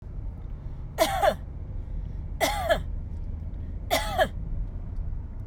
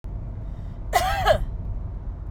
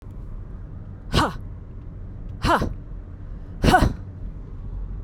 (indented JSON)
{
  "three_cough_length": "5.5 s",
  "three_cough_amplitude": 11555,
  "three_cough_signal_mean_std_ratio": 0.87,
  "cough_length": "2.3 s",
  "cough_amplitude": 16221,
  "cough_signal_mean_std_ratio": 0.82,
  "exhalation_length": "5.0 s",
  "exhalation_amplitude": 25209,
  "exhalation_signal_mean_std_ratio": 0.59,
  "survey_phase": "beta (2021-08-13 to 2022-03-07)",
  "age": "45-64",
  "gender": "Female",
  "wearing_mask": "No",
  "symptom_none": true,
  "smoker_status": "Never smoked",
  "respiratory_condition_asthma": false,
  "respiratory_condition_other": false,
  "recruitment_source": "REACT",
  "submission_delay": "2 days",
  "covid_test_result": "Negative",
  "covid_test_method": "RT-qPCR"
}